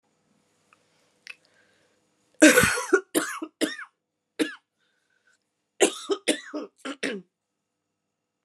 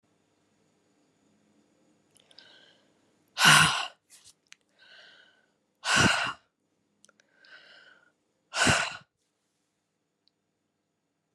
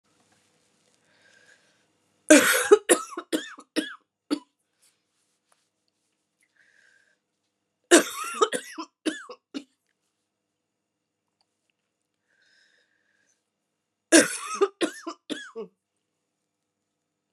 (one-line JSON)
{"cough_length": "8.4 s", "cough_amplitude": 27789, "cough_signal_mean_std_ratio": 0.28, "exhalation_length": "11.3 s", "exhalation_amplitude": 18605, "exhalation_signal_mean_std_ratio": 0.26, "three_cough_length": "17.3 s", "three_cough_amplitude": 30160, "three_cough_signal_mean_std_ratio": 0.22, "survey_phase": "beta (2021-08-13 to 2022-03-07)", "age": "45-64", "gender": "Female", "wearing_mask": "No", "symptom_cough_any": true, "symptom_runny_or_blocked_nose": true, "symptom_fatigue": true, "symptom_headache": true, "symptom_loss_of_taste": true, "symptom_onset": "5 days", "smoker_status": "Never smoked", "respiratory_condition_asthma": false, "respiratory_condition_other": false, "recruitment_source": "Test and Trace", "submission_delay": "2 days", "covid_test_result": "Positive", "covid_test_method": "RT-qPCR", "covid_ct_value": 15.7, "covid_ct_gene": "ORF1ab gene", "covid_ct_mean": 16.0, "covid_viral_load": "5500000 copies/ml", "covid_viral_load_category": "High viral load (>1M copies/ml)"}